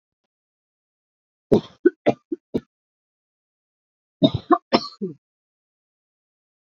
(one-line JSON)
{"cough_length": "6.7 s", "cough_amplitude": 27359, "cough_signal_mean_std_ratio": 0.21, "survey_phase": "beta (2021-08-13 to 2022-03-07)", "age": "45-64", "gender": "Female", "wearing_mask": "No", "symptom_cough_any": true, "symptom_runny_or_blocked_nose": true, "symptom_shortness_of_breath": true, "symptom_abdominal_pain": true, "symptom_diarrhoea": true, "symptom_fatigue": true, "symptom_fever_high_temperature": true, "symptom_headache": true, "symptom_other": true, "symptom_onset": "3 days", "smoker_status": "Never smoked", "respiratory_condition_asthma": false, "respiratory_condition_other": false, "recruitment_source": "Test and Trace", "submission_delay": "2 days", "covid_test_result": "Positive", "covid_test_method": "RT-qPCR", "covid_ct_value": 23.3, "covid_ct_gene": "ORF1ab gene"}